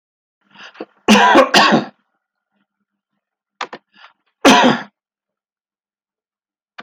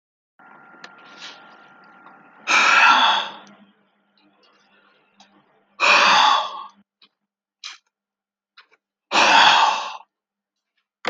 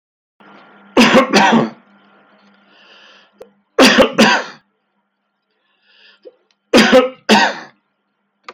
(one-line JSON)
{"cough_length": "6.8 s", "cough_amplitude": 32383, "cough_signal_mean_std_ratio": 0.33, "exhalation_length": "11.1 s", "exhalation_amplitude": 30623, "exhalation_signal_mean_std_ratio": 0.39, "three_cough_length": "8.5 s", "three_cough_amplitude": 32768, "three_cough_signal_mean_std_ratio": 0.4, "survey_phase": "beta (2021-08-13 to 2022-03-07)", "age": "65+", "gender": "Male", "wearing_mask": "No", "symptom_cough_any": true, "symptom_onset": "9 days", "smoker_status": "Ex-smoker", "respiratory_condition_asthma": false, "respiratory_condition_other": false, "recruitment_source": "REACT", "submission_delay": "8 days", "covid_test_result": "Positive", "covid_test_method": "RT-qPCR", "covid_ct_value": 37.0, "covid_ct_gene": "N gene"}